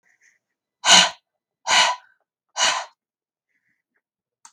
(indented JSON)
{
  "exhalation_length": "4.5 s",
  "exhalation_amplitude": 32768,
  "exhalation_signal_mean_std_ratio": 0.31,
  "survey_phase": "beta (2021-08-13 to 2022-03-07)",
  "age": "45-64",
  "gender": "Female",
  "wearing_mask": "No",
  "symptom_cough_any": true,
  "symptom_shortness_of_breath": true,
  "symptom_onset": "12 days",
  "smoker_status": "Never smoked",
  "respiratory_condition_asthma": false,
  "respiratory_condition_other": false,
  "recruitment_source": "REACT",
  "submission_delay": "3 days",
  "covid_test_result": "Negative",
  "covid_test_method": "RT-qPCR"
}